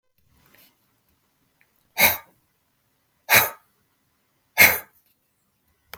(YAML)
exhalation_length: 6.0 s
exhalation_amplitude: 32766
exhalation_signal_mean_std_ratio: 0.23
survey_phase: beta (2021-08-13 to 2022-03-07)
age: 45-64
gender: Male
wearing_mask: 'No'
symptom_none: true
smoker_status: Ex-smoker
respiratory_condition_asthma: false
respiratory_condition_other: false
recruitment_source: REACT
submission_delay: 1 day
covid_test_result: Negative
covid_test_method: RT-qPCR
influenza_a_test_result: Negative
influenza_b_test_result: Negative